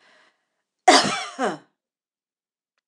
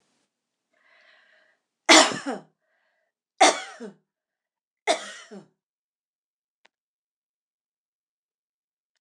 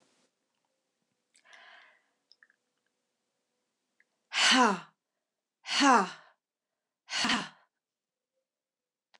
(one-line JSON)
{"cough_length": "2.9 s", "cough_amplitude": 26027, "cough_signal_mean_std_ratio": 0.28, "three_cough_length": "9.0 s", "three_cough_amplitude": 26028, "three_cough_signal_mean_std_ratio": 0.19, "exhalation_length": "9.2 s", "exhalation_amplitude": 11982, "exhalation_signal_mean_std_ratio": 0.27, "survey_phase": "beta (2021-08-13 to 2022-03-07)", "age": "65+", "gender": "Female", "wearing_mask": "No", "symptom_none": true, "smoker_status": "Ex-smoker", "respiratory_condition_asthma": false, "respiratory_condition_other": false, "recruitment_source": "REACT", "submission_delay": "2 days", "covid_test_result": "Negative", "covid_test_method": "RT-qPCR"}